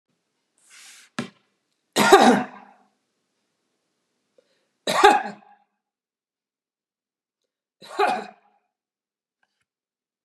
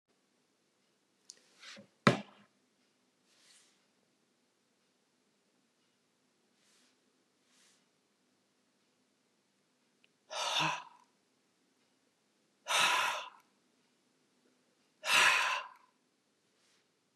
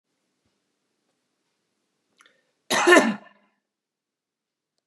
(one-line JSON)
{"three_cough_length": "10.2 s", "three_cough_amplitude": 32767, "three_cough_signal_mean_std_ratio": 0.24, "exhalation_length": "17.2 s", "exhalation_amplitude": 12026, "exhalation_signal_mean_std_ratio": 0.25, "cough_length": "4.9 s", "cough_amplitude": 26720, "cough_signal_mean_std_ratio": 0.22, "survey_phase": "beta (2021-08-13 to 2022-03-07)", "age": "45-64", "gender": "Female", "wearing_mask": "No", "symptom_none": true, "symptom_onset": "3 days", "smoker_status": "Current smoker (e-cigarettes or vapes only)", "respiratory_condition_asthma": false, "respiratory_condition_other": false, "recruitment_source": "REACT", "submission_delay": "2 days", "covid_test_result": "Negative", "covid_test_method": "RT-qPCR", "influenza_a_test_result": "Negative", "influenza_b_test_result": "Negative"}